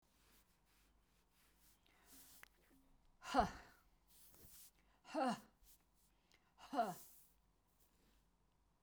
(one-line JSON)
{"exhalation_length": "8.8 s", "exhalation_amplitude": 2141, "exhalation_signal_mean_std_ratio": 0.27, "survey_phase": "beta (2021-08-13 to 2022-03-07)", "age": "65+", "gender": "Female", "wearing_mask": "No", "symptom_runny_or_blocked_nose": true, "smoker_status": "Never smoked", "respiratory_condition_asthma": false, "respiratory_condition_other": false, "recruitment_source": "REACT", "submission_delay": "1 day", "covid_test_result": "Negative", "covid_test_method": "RT-qPCR"}